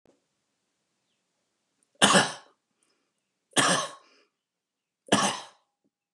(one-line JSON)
{"three_cough_length": "6.1 s", "three_cough_amplitude": 18034, "three_cough_signal_mean_std_ratio": 0.28, "survey_phase": "beta (2021-08-13 to 2022-03-07)", "age": "45-64", "gender": "Male", "wearing_mask": "No", "symptom_none": true, "smoker_status": "Ex-smoker", "respiratory_condition_asthma": false, "respiratory_condition_other": false, "recruitment_source": "REACT", "submission_delay": "4 days", "covid_test_result": "Negative", "covid_test_method": "RT-qPCR", "influenza_a_test_result": "Negative", "influenza_b_test_result": "Negative"}